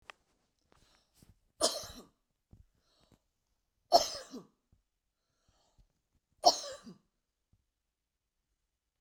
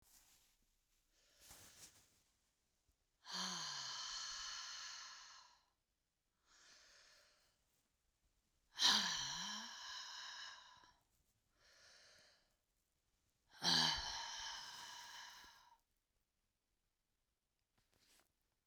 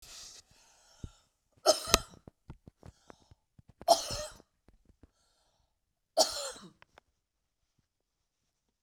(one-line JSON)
{"three_cough_length": "9.0 s", "three_cough_amplitude": 11327, "three_cough_signal_mean_std_ratio": 0.18, "exhalation_length": "18.7 s", "exhalation_amplitude": 2752, "exhalation_signal_mean_std_ratio": 0.36, "cough_length": "8.8 s", "cough_amplitude": 24525, "cough_signal_mean_std_ratio": 0.22, "survey_phase": "beta (2021-08-13 to 2022-03-07)", "age": "65+", "gender": "Female", "wearing_mask": "No", "symptom_runny_or_blocked_nose": true, "symptom_sore_throat": true, "smoker_status": "Ex-smoker", "respiratory_condition_asthma": false, "respiratory_condition_other": false, "recruitment_source": "REACT", "submission_delay": "2 days", "covid_test_result": "Negative", "covid_test_method": "RT-qPCR", "influenza_a_test_result": "Negative", "influenza_b_test_result": "Negative"}